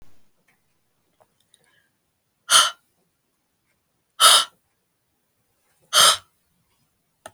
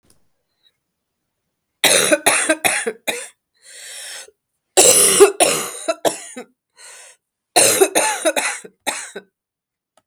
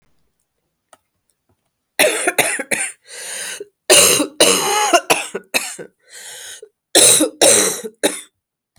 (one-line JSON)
{"exhalation_length": "7.3 s", "exhalation_amplitude": 32768, "exhalation_signal_mean_std_ratio": 0.24, "three_cough_length": "10.1 s", "three_cough_amplitude": 32768, "three_cough_signal_mean_std_ratio": 0.43, "cough_length": "8.8 s", "cough_amplitude": 32768, "cough_signal_mean_std_ratio": 0.47, "survey_phase": "beta (2021-08-13 to 2022-03-07)", "age": "65+", "gender": "Female", "wearing_mask": "No", "symptom_cough_any": true, "symptom_runny_or_blocked_nose": true, "symptom_sore_throat": true, "symptom_fatigue": true, "symptom_headache": true, "symptom_onset": "6 days", "smoker_status": "Never smoked", "respiratory_condition_asthma": false, "respiratory_condition_other": false, "recruitment_source": "Test and Trace", "submission_delay": "1 day", "covid_test_result": "Positive", "covid_test_method": "ePCR"}